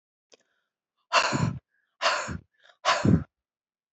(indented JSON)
{
  "exhalation_length": "3.9 s",
  "exhalation_amplitude": 13932,
  "exhalation_signal_mean_std_ratio": 0.4,
  "survey_phase": "beta (2021-08-13 to 2022-03-07)",
  "age": "65+",
  "gender": "Female",
  "wearing_mask": "No",
  "symptom_cough_any": true,
  "smoker_status": "Never smoked",
  "respiratory_condition_asthma": true,
  "respiratory_condition_other": false,
  "recruitment_source": "REACT",
  "submission_delay": "2 days",
  "covid_test_result": "Negative",
  "covid_test_method": "RT-qPCR",
  "influenza_a_test_result": "Negative",
  "influenza_b_test_result": "Negative"
}